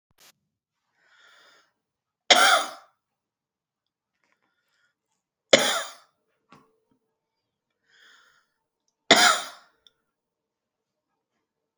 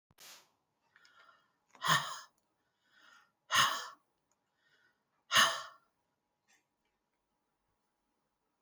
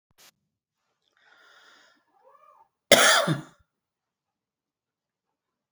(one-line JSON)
{"three_cough_length": "11.8 s", "three_cough_amplitude": 30685, "three_cough_signal_mean_std_ratio": 0.21, "exhalation_length": "8.6 s", "exhalation_amplitude": 7080, "exhalation_signal_mean_std_ratio": 0.24, "cough_length": "5.7 s", "cough_amplitude": 32581, "cough_signal_mean_std_ratio": 0.21, "survey_phase": "beta (2021-08-13 to 2022-03-07)", "age": "45-64", "gender": "Female", "wearing_mask": "No", "symptom_none": true, "smoker_status": "Never smoked", "respiratory_condition_asthma": false, "respiratory_condition_other": false, "recruitment_source": "REACT", "submission_delay": "1 day", "covid_test_result": "Negative", "covid_test_method": "RT-qPCR"}